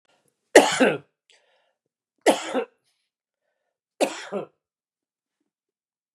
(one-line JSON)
{"cough_length": "6.1 s", "cough_amplitude": 32701, "cough_signal_mean_std_ratio": 0.25, "survey_phase": "beta (2021-08-13 to 2022-03-07)", "age": "65+", "gender": "Male", "wearing_mask": "No", "symptom_headache": true, "smoker_status": "Ex-smoker", "respiratory_condition_asthma": false, "respiratory_condition_other": false, "recruitment_source": "REACT", "submission_delay": "2 days", "covid_test_result": "Negative", "covid_test_method": "RT-qPCR"}